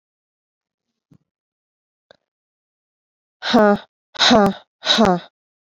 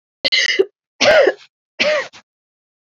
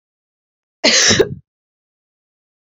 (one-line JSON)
{"exhalation_length": "5.6 s", "exhalation_amplitude": 31534, "exhalation_signal_mean_std_ratio": 0.31, "three_cough_length": "3.0 s", "three_cough_amplitude": 27981, "three_cough_signal_mean_std_ratio": 0.46, "cough_length": "2.6 s", "cough_amplitude": 32767, "cough_signal_mean_std_ratio": 0.33, "survey_phase": "beta (2021-08-13 to 2022-03-07)", "age": "18-44", "gender": "Female", "wearing_mask": "No", "symptom_cough_any": true, "symptom_runny_or_blocked_nose": true, "symptom_sore_throat": true, "symptom_fatigue": true, "symptom_change_to_sense_of_smell_or_taste": true, "symptom_loss_of_taste": true, "smoker_status": "Never smoked", "respiratory_condition_asthma": false, "respiratory_condition_other": false, "recruitment_source": "Test and Trace", "submission_delay": "2 days", "covid_test_result": "Positive", "covid_test_method": "RT-qPCR", "covid_ct_value": 19.9, "covid_ct_gene": "N gene"}